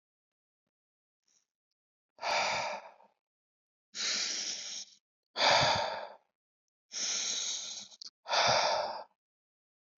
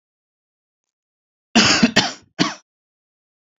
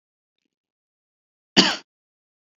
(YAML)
exhalation_length: 10.0 s
exhalation_amplitude: 7200
exhalation_signal_mean_std_ratio: 0.47
three_cough_length: 3.6 s
three_cough_amplitude: 29698
three_cough_signal_mean_std_ratio: 0.31
cough_length: 2.6 s
cough_amplitude: 32767
cough_signal_mean_std_ratio: 0.18
survey_phase: beta (2021-08-13 to 2022-03-07)
age: 18-44
gender: Male
wearing_mask: 'No'
symptom_none: true
smoker_status: Never smoked
respiratory_condition_asthma: false
respiratory_condition_other: false
recruitment_source: REACT
submission_delay: 2 days
covid_test_result: Negative
covid_test_method: RT-qPCR
influenza_a_test_result: Negative
influenza_b_test_result: Negative